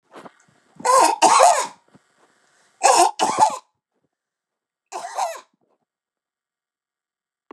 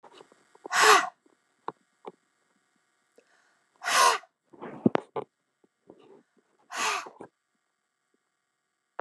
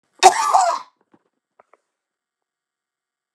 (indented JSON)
{
  "three_cough_length": "7.5 s",
  "three_cough_amplitude": 32768,
  "three_cough_signal_mean_std_ratio": 0.36,
  "exhalation_length": "9.0 s",
  "exhalation_amplitude": 18445,
  "exhalation_signal_mean_std_ratio": 0.26,
  "cough_length": "3.3 s",
  "cough_amplitude": 32768,
  "cough_signal_mean_std_ratio": 0.28,
  "survey_phase": "beta (2021-08-13 to 2022-03-07)",
  "age": "65+",
  "gender": "Female",
  "wearing_mask": "No",
  "symptom_none": true,
  "smoker_status": "Ex-smoker",
  "respiratory_condition_asthma": false,
  "respiratory_condition_other": false,
  "recruitment_source": "REACT",
  "submission_delay": "1 day",
  "covid_test_result": "Negative",
  "covid_test_method": "RT-qPCR",
  "influenza_a_test_result": "Negative",
  "influenza_b_test_result": "Negative"
}